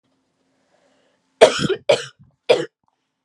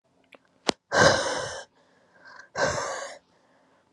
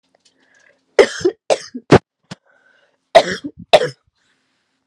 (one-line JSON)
{"three_cough_length": "3.2 s", "three_cough_amplitude": 32768, "three_cough_signal_mean_std_ratio": 0.28, "exhalation_length": "3.9 s", "exhalation_amplitude": 26748, "exhalation_signal_mean_std_ratio": 0.39, "cough_length": "4.9 s", "cough_amplitude": 32768, "cough_signal_mean_std_ratio": 0.26, "survey_phase": "beta (2021-08-13 to 2022-03-07)", "age": "18-44", "gender": "Female", "wearing_mask": "No", "symptom_cough_any": true, "symptom_runny_or_blocked_nose": true, "symptom_diarrhoea": true, "symptom_fatigue": true, "symptom_loss_of_taste": true, "smoker_status": "Current smoker (1 to 10 cigarettes per day)", "respiratory_condition_asthma": false, "respiratory_condition_other": false, "recruitment_source": "Test and Trace", "submission_delay": "2 days", "covid_test_result": "Positive", "covid_test_method": "RT-qPCR", "covid_ct_value": 22.9, "covid_ct_gene": "ORF1ab gene"}